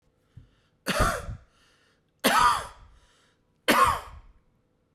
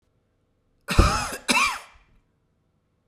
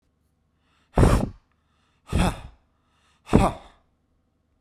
{"three_cough_length": "4.9 s", "three_cough_amplitude": 17132, "three_cough_signal_mean_std_ratio": 0.39, "cough_length": "3.1 s", "cough_amplitude": 27503, "cough_signal_mean_std_ratio": 0.35, "exhalation_length": "4.6 s", "exhalation_amplitude": 29648, "exhalation_signal_mean_std_ratio": 0.31, "survey_phase": "beta (2021-08-13 to 2022-03-07)", "age": "45-64", "gender": "Male", "wearing_mask": "No", "symptom_none": true, "smoker_status": "Never smoked", "respiratory_condition_asthma": false, "respiratory_condition_other": false, "recruitment_source": "REACT", "submission_delay": "2 days", "covid_test_result": "Negative", "covid_test_method": "RT-qPCR"}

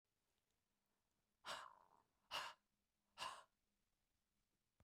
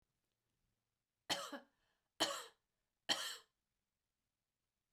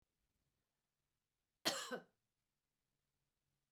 {"exhalation_length": "4.8 s", "exhalation_amplitude": 659, "exhalation_signal_mean_std_ratio": 0.31, "three_cough_length": "4.9 s", "three_cough_amplitude": 2885, "three_cough_signal_mean_std_ratio": 0.27, "cough_length": "3.7 s", "cough_amplitude": 2214, "cough_signal_mean_std_ratio": 0.21, "survey_phase": "beta (2021-08-13 to 2022-03-07)", "age": "45-64", "gender": "Female", "wearing_mask": "No", "symptom_none": true, "symptom_onset": "12 days", "smoker_status": "Never smoked", "respiratory_condition_asthma": false, "respiratory_condition_other": false, "recruitment_source": "REACT", "submission_delay": "1 day", "covid_test_result": "Negative", "covid_test_method": "RT-qPCR", "influenza_a_test_result": "Negative", "influenza_b_test_result": "Negative"}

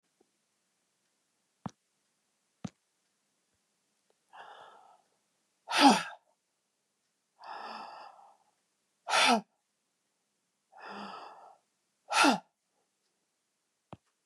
{"exhalation_length": "14.3 s", "exhalation_amplitude": 13246, "exhalation_signal_mean_std_ratio": 0.22, "survey_phase": "beta (2021-08-13 to 2022-03-07)", "age": "65+", "gender": "Female", "wearing_mask": "No", "symptom_none": true, "smoker_status": "Ex-smoker", "respiratory_condition_asthma": false, "respiratory_condition_other": false, "recruitment_source": "REACT", "submission_delay": "1 day", "covid_test_result": "Negative", "covid_test_method": "RT-qPCR", "influenza_a_test_result": "Negative", "influenza_b_test_result": "Negative"}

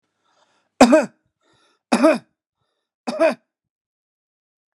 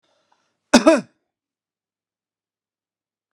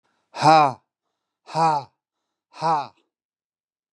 {"three_cough_length": "4.8 s", "three_cough_amplitude": 32768, "three_cough_signal_mean_std_ratio": 0.28, "cough_length": "3.3 s", "cough_amplitude": 32768, "cough_signal_mean_std_ratio": 0.2, "exhalation_length": "3.9 s", "exhalation_amplitude": 26835, "exhalation_signal_mean_std_ratio": 0.35, "survey_phase": "beta (2021-08-13 to 2022-03-07)", "age": "65+", "gender": "Male", "wearing_mask": "No", "symptom_none": true, "smoker_status": "Never smoked", "respiratory_condition_asthma": false, "respiratory_condition_other": false, "recruitment_source": "REACT", "submission_delay": "0 days", "covid_test_result": "Negative", "covid_test_method": "RT-qPCR"}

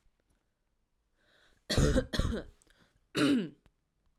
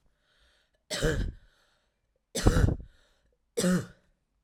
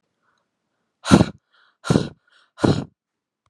{"cough_length": "4.2 s", "cough_amplitude": 5827, "cough_signal_mean_std_ratio": 0.39, "three_cough_length": "4.4 s", "three_cough_amplitude": 13362, "three_cough_signal_mean_std_ratio": 0.38, "exhalation_length": "3.5 s", "exhalation_amplitude": 32768, "exhalation_signal_mean_std_ratio": 0.27, "survey_phase": "alpha (2021-03-01 to 2021-08-12)", "age": "18-44", "gender": "Female", "wearing_mask": "No", "symptom_none": true, "smoker_status": "Never smoked", "respiratory_condition_asthma": false, "respiratory_condition_other": false, "recruitment_source": "REACT", "submission_delay": "1 day", "covid_test_result": "Negative", "covid_test_method": "RT-qPCR"}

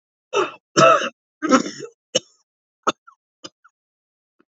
{"three_cough_length": "4.5 s", "three_cough_amplitude": 29191, "three_cough_signal_mean_std_ratio": 0.31, "survey_phase": "beta (2021-08-13 to 2022-03-07)", "age": "18-44", "gender": "Male", "wearing_mask": "No", "symptom_cough_any": true, "symptom_runny_or_blocked_nose": true, "symptom_sore_throat": true, "symptom_fatigue": true, "symptom_headache": true, "symptom_onset": "3 days", "smoker_status": "Never smoked", "respiratory_condition_asthma": false, "respiratory_condition_other": false, "recruitment_source": "Test and Trace", "submission_delay": "2 days", "covid_test_result": "Positive", "covid_test_method": "RT-qPCR", "covid_ct_value": 22.9, "covid_ct_gene": "ORF1ab gene"}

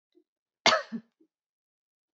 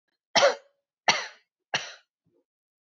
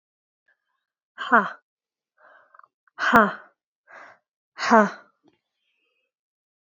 {"cough_length": "2.1 s", "cough_amplitude": 19556, "cough_signal_mean_std_ratio": 0.22, "three_cough_length": "2.8 s", "three_cough_amplitude": 19623, "three_cough_signal_mean_std_ratio": 0.29, "exhalation_length": "6.7 s", "exhalation_amplitude": 27840, "exhalation_signal_mean_std_ratio": 0.24, "survey_phase": "beta (2021-08-13 to 2022-03-07)", "age": "18-44", "gender": "Female", "wearing_mask": "No", "symptom_none": true, "smoker_status": "Never smoked", "respiratory_condition_asthma": false, "respiratory_condition_other": false, "recruitment_source": "REACT", "submission_delay": "6 days", "covid_test_result": "Negative", "covid_test_method": "RT-qPCR"}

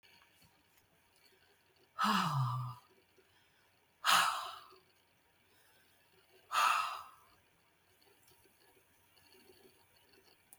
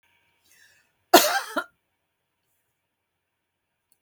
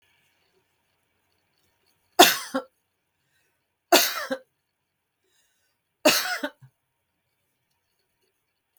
{"exhalation_length": "10.6 s", "exhalation_amplitude": 6352, "exhalation_signal_mean_std_ratio": 0.33, "cough_length": "4.0 s", "cough_amplitude": 32766, "cough_signal_mean_std_ratio": 0.19, "three_cough_length": "8.8 s", "three_cough_amplitude": 32766, "three_cough_signal_mean_std_ratio": 0.21, "survey_phase": "beta (2021-08-13 to 2022-03-07)", "age": "65+", "gender": "Female", "wearing_mask": "No", "symptom_none": true, "smoker_status": "Never smoked", "respiratory_condition_asthma": false, "respiratory_condition_other": false, "recruitment_source": "REACT", "submission_delay": "1 day", "covid_test_result": "Negative", "covid_test_method": "RT-qPCR", "influenza_a_test_result": "Negative", "influenza_b_test_result": "Negative"}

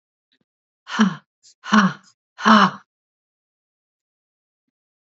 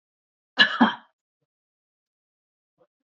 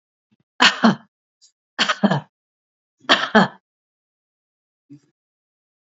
{"exhalation_length": "5.1 s", "exhalation_amplitude": 29252, "exhalation_signal_mean_std_ratio": 0.29, "cough_length": "3.2 s", "cough_amplitude": 26272, "cough_signal_mean_std_ratio": 0.21, "three_cough_length": "5.9 s", "three_cough_amplitude": 32768, "three_cough_signal_mean_std_ratio": 0.28, "survey_phase": "beta (2021-08-13 to 2022-03-07)", "age": "45-64", "gender": "Female", "wearing_mask": "No", "symptom_none": true, "smoker_status": "Never smoked", "respiratory_condition_asthma": false, "respiratory_condition_other": false, "recruitment_source": "REACT", "submission_delay": "7 days", "covid_test_result": "Negative", "covid_test_method": "RT-qPCR", "influenza_a_test_result": "Negative", "influenza_b_test_result": "Negative"}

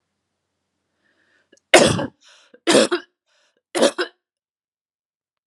{"three_cough_length": "5.5 s", "three_cough_amplitude": 32768, "three_cough_signal_mean_std_ratio": 0.28, "survey_phase": "beta (2021-08-13 to 2022-03-07)", "age": "45-64", "gender": "Female", "wearing_mask": "No", "symptom_cough_any": true, "symptom_sore_throat": true, "smoker_status": "Never smoked", "respiratory_condition_asthma": false, "respiratory_condition_other": false, "recruitment_source": "Test and Trace", "submission_delay": "2 days", "covid_test_result": "Positive", "covid_test_method": "RT-qPCR"}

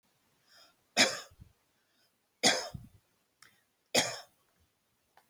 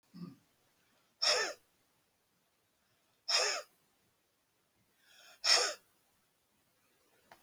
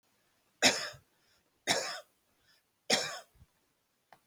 {"three_cough_length": "5.3 s", "three_cough_amplitude": 12171, "three_cough_signal_mean_std_ratio": 0.26, "exhalation_length": "7.4 s", "exhalation_amplitude": 7918, "exhalation_signal_mean_std_ratio": 0.29, "cough_length": "4.3 s", "cough_amplitude": 9055, "cough_signal_mean_std_ratio": 0.3, "survey_phase": "alpha (2021-03-01 to 2021-08-12)", "age": "65+", "gender": "Female", "wearing_mask": "No", "symptom_none": true, "smoker_status": "Ex-smoker", "respiratory_condition_asthma": false, "respiratory_condition_other": true, "recruitment_source": "REACT", "submission_delay": "11 days", "covid_test_result": "Negative", "covid_test_method": "RT-qPCR"}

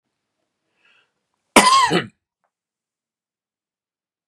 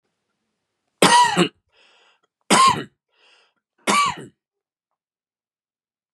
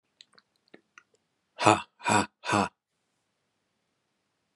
{"cough_length": "4.3 s", "cough_amplitude": 32768, "cough_signal_mean_std_ratio": 0.25, "three_cough_length": "6.1 s", "three_cough_amplitude": 32760, "three_cough_signal_mean_std_ratio": 0.32, "exhalation_length": "4.6 s", "exhalation_amplitude": 25859, "exhalation_signal_mean_std_ratio": 0.25, "survey_phase": "beta (2021-08-13 to 2022-03-07)", "age": "45-64", "gender": "Male", "wearing_mask": "No", "symptom_abdominal_pain": true, "symptom_onset": "5 days", "smoker_status": "Never smoked", "respiratory_condition_asthma": false, "respiratory_condition_other": false, "recruitment_source": "REACT", "submission_delay": "5 days", "covid_test_result": "Negative", "covid_test_method": "RT-qPCR", "influenza_a_test_result": "Negative", "influenza_b_test_result": "Negative"}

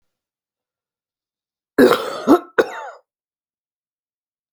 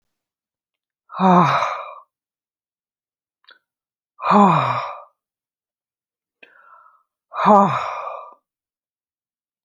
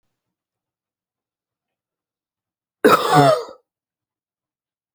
{"cough_length": "4.5 s", "cough_amplitude": 31169, "cough_signal_mean_std_ratio": 0.26, "exhalation_length": "9.6 s", "exhalation_amplitude": 28697, "exhalation_signal_mean_std_ratio": 0.34, "three_cough_length": "4.9 s", "three_cough_amplitude": 29318, "three_cough_signal_mean_std_ratio": 0.26, "survey_phase": "alpha (2021-03-01 to 2021-08-12)", "age": "45-64", "gender": "Female", "wearing_mask": "No", "symptom_fatigue": true, "symptom_change_to_sense_of_smell_or_taste": true, "symptom_onset": "12 days", "smoker_status": "Current smoker (11 or more cigarettes per day)", "respiratory_condition_asthma": true, "respiratory_condition_other": false, "recruitment_source": "REACT", "submission_delay": "2 days", "covid_test_result": "Negative", "covid_test_method": "RT-qPCR"}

